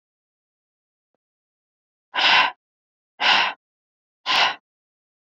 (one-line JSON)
{"exhalation_length": "5.4 s", "exhalation_amplitude": 22669, "exhalation_signal_mean_std_ratio": 0.33, "survey_phase": "beta (2021-08-13 to 2022-03-07)", "age": "45-64", "gender": "Female", "wearing_mask": "No", "symptom_cough_any": true, "symptom_runny_or_blocked_nose": true, "symptom_shortness_of_breath": true, "symptom_fatigue": true, "symptom_headache": true, "symptom_onset": "3 days", "smoker_status": "Ex-smoker", "respiratory_condition_asthma": false, "respiratory_condition_other": false, "recruitment_source": "Test and Trace", "submission_delay": "1 day", "covid_test_result": "Positive", "covid_test_method": "ePCR"}